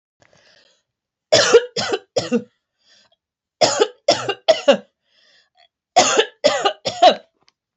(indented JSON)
{
  "three_cough_length": "7.8 s",
  "three_cough_amplitude": 29949,
  "three_cough_signal_mean_std_ratio": 0.38,
  "survey_phase": "beta (2021-08-13 to 2022-03-07)",
  "age": "18-44",
  "gender": "Female",
  "wearing_mask": "No",
  "symptom_runny_or_blocked_nose": true,
  "symptom_headache": true,
  "symptom_change_to_sense_of_smell_or_taste": true,
  "symptom_loss_of_taste": true,
  "symptom_onset": "3 days",
  "smoker_status": "Never smoked",
  "respiratory_condition_asthma": false,
  "respiratory_condition_other": false,
  "recruitment_source": "Test and Trace",
  "submission_delay": "1 day",
  "covid_test_result": "Positive",
  "covid_test_method": "RT-qPCR",
  "covid_ct_value": 26.8,
  "covid_ct_gene": "ORF1ab gene"
}